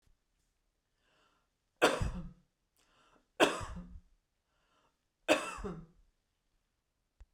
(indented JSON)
{
  "three_cough_length": "7.3 s",
  "three_cough_amplitude": 9331,
  "three_cough_signal_mean_std_ratio": 0.26,
  "survey_phase": "beta (2021-08-13 to 2022-03-07)",
  "age": "45-64",
  "gender": "Female",
  "wearing_mask": "No",
  "symptom_none": true,
  "smoker_status": "Never smoked",
  "respiratory_condition_asthma": false,
  "respiratory_condition_other": false,
  "recruitment_source": "REACT",
  "submission_delay": "1 day",
  "covid_test_result": "Negative",
  "covid_test_method": "RT-qPCR"
}